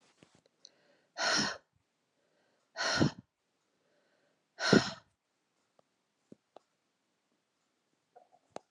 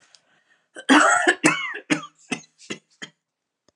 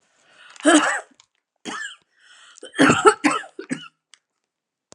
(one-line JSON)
{"exhalation_length": "8.7 s", "exhalation_amplitude": 13754, "exhalation_signal_mean_std_ratio": 0.24, "cough_length": "3.8 s", "cough_amplitude": 32457, "cough_signal_mean_std_ratio": 0.38, "three_cough_length": "4.9 s", "three_cough_amplitude": 32768, "three_cough_signal_mean_std_ratio": 0.34, "survey_phase": "alpha (2021-03-01 to 2021-08-12)", "age": "45-64", "gender": "Female", "wearing_mask": "No", "symptom_cough_any": true, "symptom_shortness_of_breath": true, "symptom_fatigue": true, "symptom_fever_high_temperature": true, "symptom_headache": true, "symptom_change_to_sense_of_smell_or_taste": true, "symptom_onset": "6 days", "smoker_status": "Never smoked", "respiratory_condition_asthma": true, "respiratory_condition_other": false, "recruitment_source": "Test and Trace", "submission_delay": "2 days", "covid_test_result": "Positive", "covid_test_method": "RT-qPCR", "covid_ct_value": 24.0, "covid_ct_gene": "N gene", "covid_ct_mean": 24.9, "covid_viral_load": "6800 copies/ml", "covid_viral_load_category": "Minimal viral load (< 10K copies/ml)"}